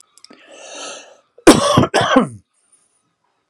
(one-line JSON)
{"cough_length": "3.5 s", "cough_amplitude": 32768, "cough_signal_mean_std_ratio": 0.36, "survey_phase": "alpha (2021-03-01 to 2021-08-12)", "age": "45-64", "gender": "Male", "wearing_mask": "No", "symptom_none": true, "smoker_status": "Ex-smoker", "respiratory_condition_asthma": false, "respiratory_condition_other": false, "recruitment_source": "REACT", "submission_delay": "3 days", "covid_test_result": "Negative", "covid_test_method": "RT-qPCR"}